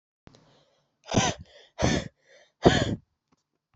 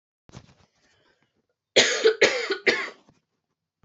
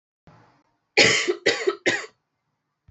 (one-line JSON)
{"exhalation_length": "3.8 s", "exhalation_amplitude": 24910, "exhalation_signal_mean_std_ratio": 0.33, "cough_length": "3.8 s", "cough_amplitude": 24853, "cough_signal_mean_std_ratio": 0.35, "three_cough_length": "2.9 s", "three_cough_amplitude": 28898, "three_cough_signal_mean_std_ratio": 0.39, "survey_phase": "alpha (2021-03-01 to 2021-08-12)", "age": "18-44", "gender": "Female", "wearing_mask": "No", "symptom_cough_any": true, "symptom_fever_high_temperature": true, "symptom_change_to_sense_of_smell_or_taste": true, "symptom_loss_of_taste": true, "symptom_onset": "5 days", "smoker_status": "Never smoked", "respiratory_condition_asthma": false, "respiratory_condition_other": false, "recruitment_source": "Test and Trace", "submission_delay": "3 days", "covid_test_result": "Positive", "covid_test_method": "RT-qPCR", "covid_ct_value": 21.6, "covid_ct_gene": "ORF1ab gene", "covid_ct_mean": 22.9, "covid_viral_load": "30000 copies/ml", "covid_viral_load_category": "Low viral load (10K-1M copies/ml)"}